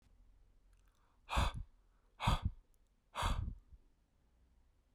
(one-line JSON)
{"exhalation_length": "4.9 s", "exhalation_amplitude": 3410, "exhalation_signal_mean_std_ratio": 0.37, "survey_phase": "beta (2021-08-13 to 2022-03-07)", "age": "18-44", "gender": "Male", "wearing_mask": "No", "symptom_cough_any": true, "symptom_runny_or_blocked_nose": true, "symptom_change_to_sense_of_smell_or_taste": true, "smoker_status": "Current smoker (e-cigarettes or vapes only)", "respiratory_condition_asthma": false, "respiratory_condition_other": false, "recruitment_source": "Test and Trace", "submission_delay": "1 day", "covid_test_result": "Positive", "covid_test_method": "RT-qPCR", "covid_ct_value": 33.9, "covid_ct_gene": "ORF1ab gene"}